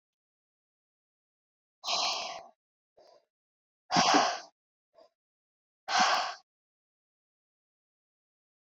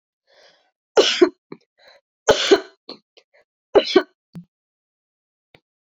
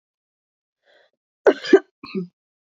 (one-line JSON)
{"exhalation_length": "8.6 s", "exhalation_amplitude": 9850, "exhalation_signal_mean_std_ratio": 0.3, "three_cough_length": "5.8 s", "three_cough_amplitude": 32767, "three_cough_signal_mean_std_ratio": 0.27, "cough_length": "2.7 s", "cough_amplitude": 26704, "cough_signal_mean_std_ratio": 0.21, "survey_phase": "beta (2021-08-13 to 2022-03-07)", "age": "18-44", "gender": "Female", "wearing_mask": "No", "symptom_cough_any": true, "symptom_runny_or_blocked_nose": true, "symptom_headache": true, "symptom_onset": "4 days", "smoker_status": "Never smoked", "respiratory_condition_asthma": false, "respiratory_condition_other": false, "recruitment_source": "Test and Trace", "submission_delay": "2 days", "covid_test_result": "Positive", "covid_test_method": "RT-qPCR", "covid_ct_value": 14.8, "covid_ct_gene": "ORF1ab gene", "covid_ct_mean": 15.8, "covid_viral_load": "6800000 copies/ml", "covid_viral_load_category": "High viral load (>1M copies/ml)"}